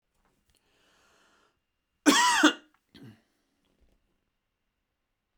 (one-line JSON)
{"cough_length": "5.4 s", "cough_amplitude": 15336, "cough_signal_mean_std_ratio": 0.24, "survey_phase": "beta (2021-08-13 to 2022-03-07)", "age": "45-64", "gender": "Male", "wearing_mask": "No", "symptom_none": true, "smoker_status": "Never smoked", "respiratory_condition_asthma": true, "respiratory_condition_other": false, "recruitment_source": "Test and Trace", "submission_delay": "0 days", "covid_test_result": "Negative", "covid_test_method": "LFT"}